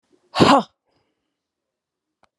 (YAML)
exhalation_length: 2.4 s
exhalation_amplitude: 28231
exhalation_signal_mean_std_ratio: 0.25
survey_phase: alpha (2021-03-01 to 2021-08-12)
age: 65+
gender: Female
wearing_mask: 'No'
symptom_none: true
smoker_status: Ex-smoker
respiratory_condition_asthma: false
respiratory_condition_other: false
recruitment_source: REACT
submission_delay: 3 days
covid_test_result: Negative
covid_test_method: RT-qPCR